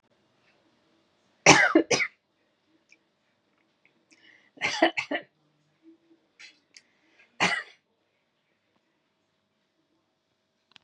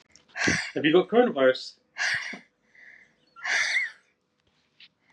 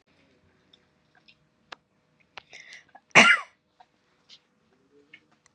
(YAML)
three_cough_length: 10.8 s
three_cough_amplitude: 31454
three_cough_signal_mean_std_ratio: 0.22
exhalation_length: 5.1 s
exhalation_amplitude: 15305
exhalation_signal_mean_std_ratio: 0.47
cough_length: 5.5 s
cough_amplitude: 27160
cough_signal_mean_std_ratio: 0.17
survey_phase: beta (2021-08-13 to 2022-03-07)
age: 45-64
gender: Female
wearing_mask: 'No'
symptom_none: true
smoker_status: Never smoked
respiratory_condition_asthma: false
respiratory_condition_other: false
recruitment_source: REACT
submission_delay: 1 day
covid_test_result: Negative
covid_test_method: RT-qPCR